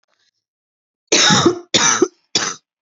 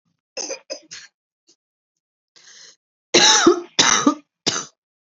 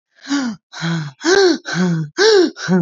{
  "cough_length": "2.8 s",
  "cough_amplitude": 32768,
  "cough_signal_mean_std_ratio": 0.47,
  "three_cough_length": "5.0 s",
  "three_cough_amplitude": 31919,
  "three_cough_signal_mean_std_ratio": 0.35,
  "exhalation_length": "2.8 s",
  "exhalation_amplitude": 28112,
  "exhalation_signal_mean_std_ratio": 0.75,
  "survey_phase": "beta (2021-08-13 to 2022-03-07)",
  "age": "18-44",
  "gender": "Female",
  "wearing_mask": "Yes",
  "symptom_none": true,
  "smoker_status": "Never smoked",
  "respiratory_condition_asthma": false,
  "respiratory_condition_other": false,
  "recruitment_source": "REACT",
  "submission_delay": "1 day",
  "covid_test_result": "Negative",
  "covid_test_method": "RT-qPCR",
  "influenza_a_test_result": "Negative",
  "influenza_b_test_result": "Negative"
}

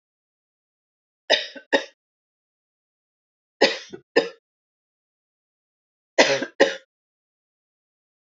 {
  "three_cough_length": "8.3 s",
  "three_cough_amplitude": 27276,
  "three_cough_signal_mean_std_ratio": 0.23,
  "survey_phase": "alpha (2021-03-01 to 2021-08-12)",
  "age": "45-64",
  "gender": "Female",
  "wearing_mask": "No",
  "symptom_none": true,
  "smoker_status": "Ex-smoker",
  "respiratory_condition_asthma": false,
  "respiratory_condition_other": false,
  "recruitment_source": "REACT",
  "submission_delay": "1 day",
  "covid_test_result": "Negative",
  "covid_test_method": "RT-qPCR"
}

